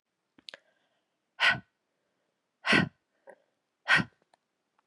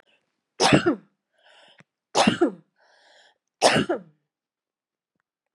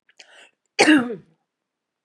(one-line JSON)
{"exhalation_length": "4.9 s", "exhalation_amplitude": 9919, "exhalation_signal_mean_std_ratio": 0.26, "three_cough_length": "5.5 s", "three_cough_amplitude": 27378, "three_cough_signal_mean_std_ratio": 0.32, "cough_length": "2.0 s", "cough_amplitude": 26567, "cough_signal_mean_std_ratio": 0.31, "survey_phase": "beta (2021-08-13 to 2022-03-07)", "age": "45-64", "gender": "Female", "wearing_mask": "No", "symptom_runny_or_blocked_nose": true, "symptom_fatigue": true, "symptom_headache": true, "symptom_change_to_sense_of_smell_or_taste": true, "symptom_loss_of_taste": true, "smoker_status": "Never smoked", "respiratory_condition_asthma": false, "respiratory_condition_other": false, "recruitment_source": "Test and Trace", "submission_delay": "3 days", "covid_test_result": "Positive", "covid_test_method": "LFT"}